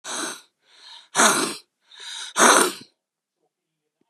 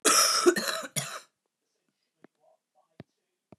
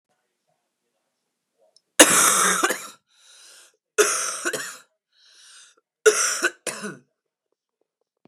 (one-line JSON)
{"exhalation_length": "4.1 s", "exhalation_amplitude": 32767, "exhalation_signal_mean_std_ratio": 0.37, "cough_length": "3.6 s", "cough_amplitude": 13171, "cough_signal_mean_std_ratio": 0.37, "three_cough_length": "8.3 s", "three_cough_amplitude": 32768, "three_cough_signal_mean_std_ratio": 0.34, "survey_phase": "beta (2021-08-13 to 2022-03-07)", "age": "45-64", "gender": "Female", "wearing_mask": "No", "symptom_cough_any": true, "symptom_runny_or_blocked_nose": true, "symptom_sore_throat": true, "symptom_onset": "12 days", "smoker_status": "Ex-smoker", "respiratory_condition_asthma": false, "respiratory_condition_other": false, "recruitment_source": "REACT", "submission_delay": "1 day", "covid_test_result": "Negative", "covid_test_method": "RT-qPCR", "influenza_a_test_result": "Unknown/Void", "influenza_b_test_result": "Unknown/Void"}